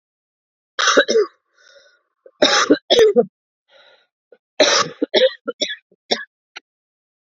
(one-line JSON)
{"three_cough_length": "7.3 s", "three_cough_amplitude": 31697, "three_cough_signal_mean_std_ratio": 0.39, "survey_phase": "beta (2021-08-13 to 2022-03-07)", "age": "45-64", "gender": "Female", "wearing_mask": "No", "symptom_cough_any": true, "symptom_runny_or_blocked_nose": true, "symptom_abdominal_pain": true, "symptom_onset": "12 days", "smoker_status": "Ex-smoker", "respiratory_condition_asthma": false, "respiratory_condition_other": false, "recruitment_source": "REACT", "submission_delay": "1 day", "covid_test_result": "Positive", "covid_test_method": "RT-qPCR", "covid_ct_value": 32.2, "covid_ct_gene": "E gene", "influenza_a_test_result": "Negative", "influenza_b_test_result": "Negative"}